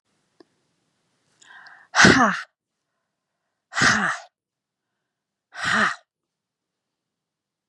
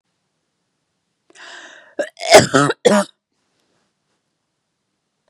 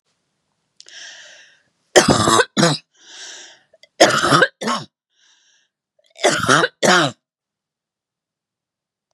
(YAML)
exhalation_length: 7.7 s
exhalation_amplitude: 30246
exhalation_signal_mean_std_ratio: 0.29
cough_length: 5.3 s
cough_amplitude: 32768
cough_signal_mean_std_ratio: 0.26
three_cough_length: 9.1 s
three_cough_amplitude: 32768
three_cough_signal_mean_std_ratio: 0.37
survey_phase: beta (2021-08-13 to 2022-03-07)
age: 45-64
gender: Female
wearing_mask: 'No'
symptom_fatigue: true
symptom_onset: 8 days
smoker_status: Ex-smoker
respiratory_condition_asthma: false
respiratory_condition_other: false
recruitment_source: REACT
submission_delay: 0 days
covid_test_result: Negative
covid_test_method: RT-qPCR
influenza_a_test_result: Negative
influenza_b_test_result: Negative